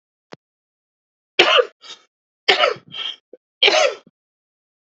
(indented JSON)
{
  "three_cough_length": "4.9 s",
  "three_cough_amplitude": 31527,
  "three_cough_signal_mean_std_ratio": 0.33,
  "survey_phase": "beta (2021-08-13 to 2022-03-07)",
  "age": "18-44",
  "gender": "Male",
  "wearing_mask": "No",
  "symptom_shortness_of_breath": true,
  "symptom_fatigue": true,
  "symptom_headache": true,
  "symptom_other": true,
  "symptom_onset": "12 days",
  "smoker_status": "Ex-smoker",
  "respiratory_condition_asthma": true,
  "respiratory_condition_other": false,
  "recruitment_source": "REACT",
  "submission_delay": "0 days",
  "covid_test_result": "Negative",
  "covid_test_method": "RT-qPCR",
  "influenza_a_test_result": "Negative",
  "influenza_b_test_result": "Negative"
}